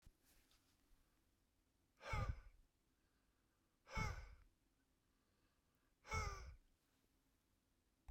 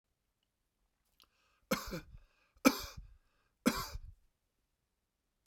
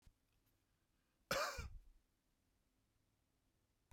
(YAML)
exhalation_length: 8.1 s
exhalation_amplitude: 872
exhalation_signal_mean_std_ratio: 0.33
three_cough_length: 5.5 s
three_cough_amplitude: 10048
three_cough_signal_mean_std_ratio: 0.23
cough_length: 3.9 s
cough_amplitude: 1350
cough_signal_mean_std_ratio: 0.27
survey_phase: beta (2021-08-13 to 2022-03-07)
age: 45-64
gender: Male
wearing_mask: 'No'
symptom_none: true
smoker_status: Ex-smoker
respiratory_condition_asthma: false
respiratory_condition_other: false
recruitment_source: REACT
submission_delay: 1 day
covid_test_result: Negative
covid_test_method: RT-qPCR
influenza_a_test_result: Negative
influenza_b_test_result: Negative